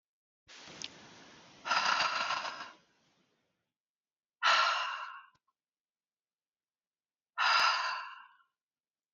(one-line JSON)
{"exhalation_length": "9.1 s", "exhalation_amplitude": 6180, "exhalation_signal_mean_std_ratio": 0.4, "survey_phase": "beta (2021-08-13 to 2022-03-07)", "age": "45-64", "gender": "Female", "wearing_mask": "No", "symptom_none": true, "smoker_status": "Never smoked", "respiratory_condition_asthma": false, "respiratory_condition_other": false, "recruitment_source": "REACT", "submission_delay": "1 day", "covid_test_result": "Negative", "covid_test_method": "RT-qPCR"}